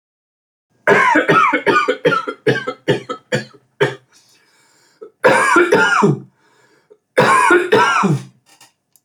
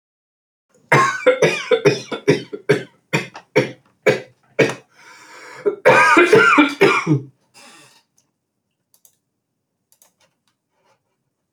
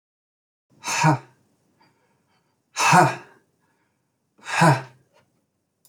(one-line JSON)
{"three_cough_length": "9.0 s", "three_cough_amplitude": 29997, "three_cough_signal_mean_std_ratio": 0.56, "cough_length": "11.5 s", "cough_amplitude": 28523, "cough_signal_mean_std_ratio": 0.41, "exhalation_length": "5.9 s", "exhalation_amplitude": 24224, "exhalation_signal_mean_std_ratio": 0.31, "survey_phase": "beta (2021-08-13 to 2022-03-07)", "age": "18-44", "gender": "Male", "wearing_mask": "No", "symptom_cough_any": true, "symptom_onset": "8 days", "smoker_status": "Prefer not to say", "respiratory_condition_asthma": true, "respiratory_condition_other": false, "recruitment_source": "REACT", "submission_delay": "2 days", "covid_test_result": "Negative", "covid_test_method": "RT-qPCR"}